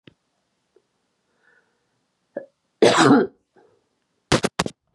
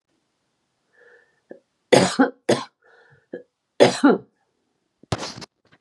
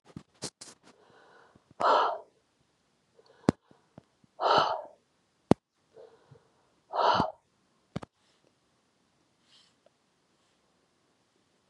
cough_length: 4.9 s
cough_amplitude: 32644
cough_signal_mean_std_ratio: 0.28
three_cough_length: 5.8 s
three_cough_amplitude: 32245
three_cough_signal_mean_std_ratio: 0.28
exhalation_length: 11.7 s
exhalation_amplitude: 21123
exhalation_signal_mean_std_ratio: 0.25
survey_phase: beta (2021-08-13 to 2022-03-07)
age: 65+
gender: Female
wearing_mask: 'No'
symptom_cough_any: true
symptom_shortness_of_breath: true
smoker_status: Never smoked
respiratory_condition_asthma: false
respiratory_condition_other: false
recruitment_source: REACT
submission_delay: 1 day
covid_test_result: Negative
covid_test_method: RT-qPCR
influenza_a_test_result: Negative
influenza_b_test_result: Negative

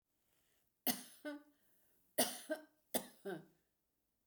three_cough_length: 4.3 s
three_cough_amplitude: 3130
three_cough_signal_mean_std_ratio: 0.31
survey_phase: beta (2021-08-13 to 2022-03-07)
age: 65+
gender: Female
wearing_mask: 'No'
symptom_fatigue: true
symptom_headache: true
smoker_status: Never smoked
respiratory_condition_asthma: false
respiratory_condition_other: false
recruitment_source: REACT
submission_delay: 1 day
covid_test_result: Negative
covid_test_method: RT-qPCR
influenza_a_test_result: Negative
influenza_b_test_result: Negative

